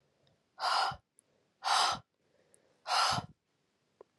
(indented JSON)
{
  "exhalation_length": "4.2 s",
  "exhalation_amplitude": 5178,
  "exhalation_signal_mean_std_ratio": 0.41,
  "survey_phase": "alpha (2021-03-01 to 2021-08-12)",
  "age": "18-44",
  "gender": "Female",
  "wearing_mask": "No",
  "symptom_cough_any": true,
  "symptom_new_continuous_cough": true,
  "symptom_fatigue": true,
  "symptom_fever_high_temperature": true,
  "symptom_headache": true,
  "symptom_onset": "3 days",
  "smoker_status": "Never smoked",
  "respiratory_condition_asthma": false,
  "respiratory_condition_other": false,
  "recruitment_source": "Test and Trace",
  "submission_delay": "2 days",
  "covid_test_method": "RT-qPCR"
}